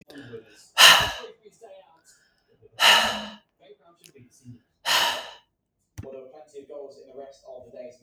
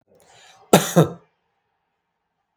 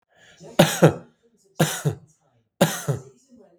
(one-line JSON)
{"exhalation_length": "8.0 s", "exhalation_amplitude": 32411, "exhalation_signal_mean_std_ratio": 0.31, "cough_length": "2.6 s", "cough_amplitude": 32768, "cough_signal_mean_std_ratio": 0.23, "three_cough_length": "3.6 s", "three_cough_amplitude": 32766, "three_cough_signal_mean_std_ratio": 0.34, "survey_phase": "beta (2021-08-13 to 2022-03-07)", "age": "18-44", "gender": "Male", "wearing_mask": "No", "symptom_none": true, "smoker_status": "Never smoked", "respiratory_condition_asthma": false, "respiratory_condition_other": false, "recruitment_source": "REACT", "submission_delay": "1 day", "covid_test_result": "Negative", "covid_test_method": "RT-qPCR", "influenza_a_test_result": "Negative", "influenza_b_test_result": "Negative"}